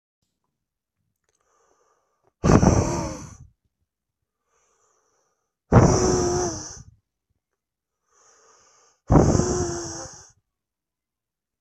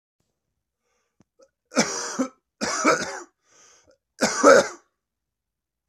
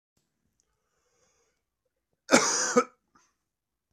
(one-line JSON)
{"exhalation_length": "11.6 s", "exhalation_amplitude": 24229, "exhalation_signal_mean_std_ratio": 0.33, "three_cough_length": "5.9 s", "three_cough_amplitude": 24612, "three_cough_signal_mean_std_ratio": 0.32, "cough_length": "3.9 s", "cough_amplitude": 22064, "cough_signal_mean_std_ratio": 0.25, "survey_phase": "beta (2021-08-13 to 2022-03-07)", "age": "18-44", "gender": "Male", "wearing_mask": "No", "symptom_cough_any": true, "symptom_new_continuous_cough": true, "symptom_runny_or_blocked_nose": true, "symptom_fatigue": true, "symptom_fever_high_temperature": true, "symptom_change_to_sense_of_smell_or_taste": true, "symptom_other": true, "symptom_onset": "5 days", "smoker_status": "Never smoked", "respiratory_condition_asthma": false, "respiratory_condition_other": false, "recruitment_source": "Test and Trace", "submission_delay": "2 days", "covid_test_result": "Positive", "covid_test_method": "RT-qPCR", "covid_ct_value": 15.4, "covid_ct_gene": "ORF1ab gene", "covid_ct_mean": 16.4, "covid_viral_load": "4200000 copies/ml", "covid_viral_load_category": "High viral load (>1M copies/ml)"}